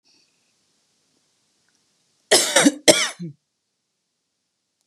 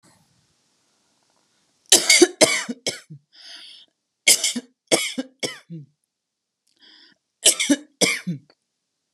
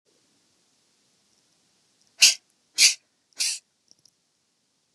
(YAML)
cough_length: 4.9 s
cough_amplitude: 32768
cough_signal_mean_std_ratio: 0.26
three_cough_length: 9.1 s
three_cough_amplitude: 32768
three_cough_signal_mean_std_ratio: 0.31
exhalation_length: 4.9 s
exhalation_amplitude: 28725
exhalation_signal_mean_std_ratio: 0.21
survey_phase: beta (2021-08-13 to 2022-03-07)
age: 18-44
gender: Female
wearing_mask: 'No'
symptom_sore_throat: true
symptom_onset: 6 days
smoker_status: Never smoked
respiratory_condition_asthma: false
respiratory_condition_other: false
recruitment_source: REACT
submission_delay: 2 days
covid_test_result: Negative
covid_test_method: RT-qPCR